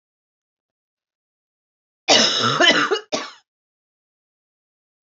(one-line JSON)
{"cough_length": "5.0 s", "cough_amplitude": 31320, "cough_signal_mean_std_ratio": 0.34, "survey_phase": "beta (2021-08-13 to 2022-03-07)", "age": "45-64", "gender": "Female", "wearing_mask": "No", "symptom_runny_or_blocked_nose": true, "smoker_status": "Never smoked", "respiratory_condition_asthma": false, "respiratory_condition_other": false, "recruitment_source": "Test and Trace", "submission_delay": "2 days", "covid_test_result": "Positive", "covid_test_method": "RT-qPCR", "covid_ct_value": 21.1, "covid_ct_gene": "ORF1ab gene", "covid_ct_mean": 21.7, "covid_viral_load": "78000 copies/ml", "covid_viral_load_category": "Low viral load (10K-1M copies/ml)"}